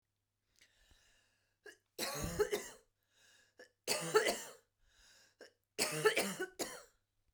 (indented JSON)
{
  "three_cough_length": "7.3 s",
  "three_cough_amplitude": 4920,
  "three_cough_signal_mean_std_ratio": 0.38,
  "survey_phase": "beta (2021-08-13 to 2022-03-07)",
  "age": "45-64",
  "gender": "Female",
  "wearing_mask": "No",
  "symptom_none": true,
  "smoker_status": "Ex-smoker",
  "respiratory_condition_asthma": false,
  "respiratory_condition_other": false,
  "recruitment_source": "REACT",
  "submission_delay": "1 day",
  "covid_test_result": "Negative",
  "covid_test_method": "RT-qPCR"
}